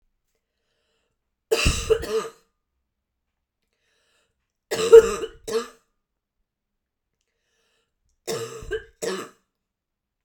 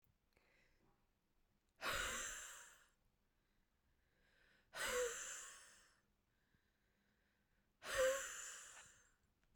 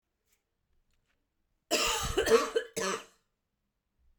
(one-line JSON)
{"three_cough_length": "10.2 s", "three_cough_amplitude": 32727, "three_cough_signal_mean_std_ratio": 0.23, "exhalation_length": "9.6 s", "exhalation_amplitude": 1378, "exhalation_signal_mean_std_ratio": 0.38, "cough_length": "4.2 s", "cough_amplitude": 10021, "cough_signal_mean_std_ratio": 0.38, "survey_phase": "beta (2021-08-13 to 2022-03-07)", "age": "45-64", "gender": "Female", "wearing_mask": "No", "symptom_none": true, "smoker_status": "Current smoker (e-cigarettes or vapes only)", "respiratory_condition_asthma": false, "respiratory_condition_other": false, "recruitment_source": "REACT", "submission_delay": "0 days", "covid_test_result": "Negative", "covid_test_method": "RT-qPCR"}